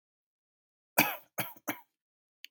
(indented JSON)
{
  "three_cough_length": "2.5 s",
  "three_cough_amplitude": 14400,
  "three_cough_signal_mean_std_ratio": 0.24,
  "survey_phase": "beta (2021-08-13 to 2022-03-07)",
  "age": "18-44",
  "gender": "Male",
  "wearing_mask": "No",
  "symptom_none": true,
  "smoker_status": "Never smoked",
  "respiratory_condition_asthma": false,
  "respiratory_condition_other": false,
  "recruitment_source": "REACT",
  "submission_delay": "1 day",
  "covid_test_result": "Negative",
  "covid_test_method": "RT-qPCR",
  "influenza_a_test_result": "Negative",
  "influenza_b_test_result": "Negative"
}